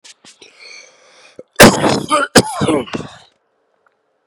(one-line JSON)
{"cough_length": "4.3 s", "cough_amplitude": 32768, "cough_signal_mean_std_ratio": 0.36, "survey_phase": "beta (2021-08-13 to 2022-03-07)", "age": "18-44", "gender": "Male", "wearing_mask": "No", "symptom_cough_any": true, "symptom_runny_or_blocked_nose": true, "symptom_diarrhoea": true, "symptom_fatigue": true, "symptom_onset": "3 days", "smoker_status": "Current smoker (e-cigarettes or vapes only)", "respiratory_condition_asthma": false, "respiratory_condition_other": false, "recruitment_source": "Test and Trace", "submission_delay": "1 day", "covid_test_result": "Positive", "covid_test_method": "RT-qPCR", "covid_ct_value": 15.1, "covid_ct_gene": "ORF1ab gene", "covid_ct_mean": 15.4, "covid_viral_load": "8900000 copies/ml", "covid_viral_load_category": "High viral load (>1M copies/ml)"}